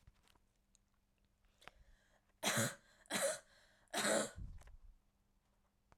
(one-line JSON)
{"three_cough_length": "6.0 s", "three_cough_amplitude": 2573, "three_cough_signal_mean_std_ratio": 0.37, "survey_phase": "alpha (2021-03-01 to 2021-08-12)", "age": "18-44", "gender": "Female", "wearing_mask": "No", "symptom_cough_any": true, "symptom_fatigue": true, "symptom_headache": true, "symptom_onset": "6 days", "smoker_status": "Never smoked", "respiratory_condition_asthma": false, "respiratory_condition_other": false, "recruitment_source": "Test and Trace", "submission_delay": "2 days", "covid_test_result": "Positive", "covid_test_method": "RT-qPCR", "covid_ct_value": 16.1, "covid_ct_gene": "ORF1ab gene", "covid_ct_mean": 17.5, "covid_viral_load": "1800000 copies/ml", "covid_viral_load_category": "High viral load (>1M copies/ml)"}